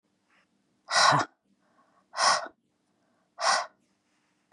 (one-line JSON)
{"exhalation_length": "4.5 s", "exhalation_amplitude": 13331, "exhalation_signal_mean_std_ratio": 0.34, "survey_phase": "beta (2021-08-13 to 2022-03-07)", "age": "45-64", "gender": "Female", "wearing_mask": "No", "symptom_cough_any": true, "symptom_fatigue": true, "symptom_change_to_sense_of_smell_or_taste": true, "symptom_loss_of_taste": true, "symptom_onset": "10 days", "smoker_status": "Never smoked", "respiratory_condition_asthma": false, "respiratory_condition_other": false, "recruitment_source": "REACT", "submission_delay": "3 days", "covid_test_result": "Positive", "covid_test_method": "RT-qPCR", "covid_ct_value": 28.0, "covid_ct_gene": "E gene", "influenza_a_test_result": "Negative", "influenza_b_test_result": "Negative"}